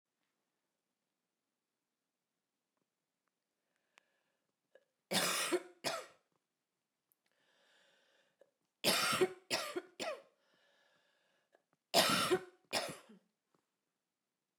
{
  "three_cough_length": "14.6 s",
  "three_cough_amplitude": 6673,
  "three_cough_signal_mean_std_ratio": 0.3,
  "survey_phase": "beta (2021-08-13 to 2022-03-07)",
  "age": "45-64",
  "gender": "Female",
  "wearing_mask": "No",
  "symptom_cough_any": true,
  "symptom_new_continuous_cough": true,
  "symptom_runny_or_blocked_nose": true,
  "symptom_fatigue": true,
  "symptom_change_to_sense_of_smell_or_taste": true,
  "symptom_loss_of_taste": true,
  "symptom_onset": "6 days",
  "smoker_status": "Never smoked",
  "respiratory_condition_asthma": false,
  "respiratory_condition_other": false,
  "recruitment_source": "Test and Trace",
  "submission_delay": "1 day",
  "covid_test_result": "Positive",
  "covid_test_method": "RT-qPCR"
}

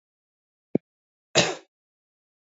{
  "cough_length": "2.5 s",
  "cough_amplitude": 19019,
  "cough_signal_mean_std_ratio": 0.2,
  "survey_phase": "beta (2021-08-13 to 2022-03-07)",
  "age": "18-44",
  "gender": "Male",
  "wearing_mask": "No",
  "symptom_cough_any": true,
  "symptom_runny_or_blocked_nose": true,
  "symptom_shortness_of_breath": true,
  "symptom_sore_throat": true,
  "symptom_fatigue": true,
  "smoker_status": "Ex-smoker",
  "respiratory_condition_asthma": false,
  "respiratory_condition_other": false,
  "recruitment_source": "Test and Trace",
  "submission_delay": "2 days",
  "covid_test_result": "Positive",
  "covid_test_method": "RT-qPCR",
  "covid_ct_value": 23.4,
  "covid_ct_gene": "ORF1ab gene"
}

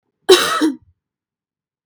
{
  "cough_length": "1.9 s",
  "cough_amplitude": 32768,
  "cough_signal_mean_std_ratio": 0.35,
  "survey_phase": "beta (2021-08-13 to 2022-03-07)",
  "age": "18-44",
  "gender": "Female",
  "wearing_mask": "No",
  "symptom_none": true,
  "smoker_status": "Never smoked",
  "respiratory_condition_asthma": true,
  "respiratory_condition_other": false,
  "recruitment_source": "REACT",
  "submission_delay": "4 days",
  "covid_test_result": "Negative",
  "covid_test_method": "RT-qPCR",
  "influenza_a_test_result": "Negative",
  "influenza_b_test_result": "Negative"
}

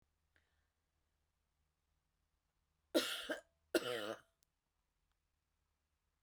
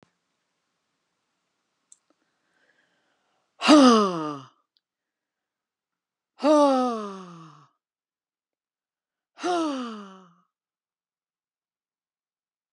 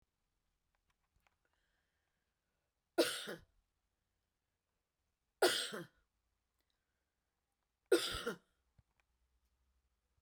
{
  "cough_length": "6.2 s",
  "cough_amplitude": 3250,
  "cough_signal_mean_std_ratio": 0.24,
  "exhalation_length": "12.7 s",
  "exhalation_amplitude": 23357,
  "exhalation_signal_mean_std_ratio": 0.26,
  "three_cough_length": "10.2 s",
  "three_cough_amplitude": 4045,
  "three_cough_signal_mean_std_ratio": 0.21,
  "survey_phase": "beta (2021-08-13 to 2022-03-07)",
  "age": "65+",
  "gender": "Female",
  "wearing_mask": "No",
  "symptom_none": true,
  "smoker_status": "Never smoked",
  "respiratory_condition_asthma": false,
  "respiratory_condition_other": false,
  "recruitment_source": "REACT",
  "submission_delay": "2 days",
  "covid_test_result": "Negative",
  "covid_test_method": "RT-qPCR"
}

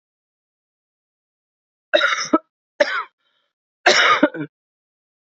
{
  "three_cough_length": "5.2 s",
  "three_cough_amplitude": 28750,
  "three_cough_signal_mean_std_ratio": 0.33,
  "survey_phase": "beta (2021-08-13 to 2022-03-07)",
  "age": "45-64",
  "gender": "Female",
  "wearing_mask": "No",
  "symptom_cough_any": true,
  "symptom_new_continuous_cough": true,
  "symptom_runny_or_blocked_nose": true,
  "symptom_sore_throat": true,
  "symptom_onset": "4 days",
  "smoker_status": "Ex-smoker",
  "respiratory_condition_asthma": false,
  "respiratory_condition_other": false,
  "recruitment_source": "Test and Trace",
  "submission_delay": "2 days",
  "covid_test_result": "Positive",
  "covid_test_method": "RT-qPCR",
  "covid_ct_value": 19.2,
  "covid_ct_gene": "ORF1ab gene"
}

